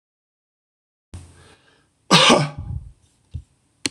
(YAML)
cough_length: 3.9 s
cough_amplitude: 26028
cough_signal_mean_std_ratio: 0.29
survey_phase: beta (2021-08-13 to 2022-03-07)
age: 18-44
gender: Male
wearing_mask: 'No'
symptom_runny_or_blocked_nose: true
symptom_headache: true
smoker_status: Never smoked
respiratory_condition_asthma: false
respiratory_condition_other: false
recruitment_source: REACT
submission_delay: 2 days
covid_test_result: Negative
covid_test_method: RT-qPCR
influenza_a_test_result: Negative
influenza_b_test_result: Negative